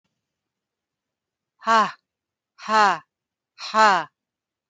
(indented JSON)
{
  "exhalation_length": "4.7 s",
  "exhalation_amplitude": 22075,
  "exhalation_signal_mean_std_ratio": 0.32,
  "survey_phase": "alpha (2021-03-01 to 2021-08-12)",
  "age": "65+",
  "gender": "Female",
  "wearing_mask": "No",
  "symptom_none": true,
  "smoker_status": "Prefer not to say",
  "respiratory_condition_asthma": false,
  "respiratory_condition_other": false,
  "recruitment_source": "REACT",
  "submission_delay": "3 days",
  "covid_test_result": "Negative",
  "covid_test_method": "RT-qPCR"
}